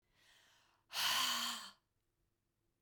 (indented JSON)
{
  "exhalation_length": "2.8 s",
  "exhalation_amplitude": 2030,
  "exhalation_signal_mean_std_ratio": 0.43,
  "survey_phase": "beta (2021-08-13 to 2022-03-07)",
  "age": "18-44",
  "gender": "Female",
  "wearing_mask": "No",
  "symptom_shortness_of_breath": true,
  "symptom_fatigue": true,
  "smoker_status": "Ex-smoker",
  "respiratory_condition_asthma": false,
  "respiratory_condition_other": false,
  "recruitment_source": "Test and Trace",
  "submission_delay": "2 days",
  "covid_test_result": "Positive",
  "covid_test_method": "LFT"
}